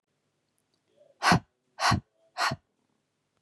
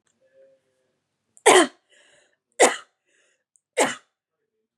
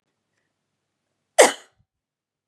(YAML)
exhalation_length: 3.4 s
exhalation_amplitude: 12112
exhalation_signal_mean_std_ratio: 0.3
three_cough_length: 4.8 s
three_cough_amplitude: 29920
three_cough_signal_mean_std_ratio: 0.24
cough_length: 2.5 s
cough_amplitude: 32413
cough_signal_mean_std_ratio: 0.17
survey_phase: beta (2021-08-13 to 2022-03-07)
age: 18-44
gender: Female
wearing_mask: 'No'
symptom_none: true
symptom_onset: 3 days
smoker_status: Prefer not to say
respiratory_condition_asthma: false
respiratory_condition_other: false
recruitment_source: REACT
submission_delay: 1 day
covid_test_result: Negative
covid_test_method: RT-qPCR
influenza_a_test_result: Negative
influenza_b_test_result: Negative